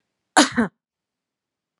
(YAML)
cough_length: 1.8 s
cough_amplitude: 29870
cough_signal_mean_std_ratio: 0.26
survey_phase: beta (2021-08-13 to 2022-03-07)
age: 45-64
gender: Female
wearing_mask: 'No'
symptom_none: true
smoker_status: Never smoked
respiratory_condition_asthma: false
respiratory_condition_other: false
recruitment_source: REACT
submission_delay: 2 days
covid_test_result: Negative
covid_test_method: RT-qPCR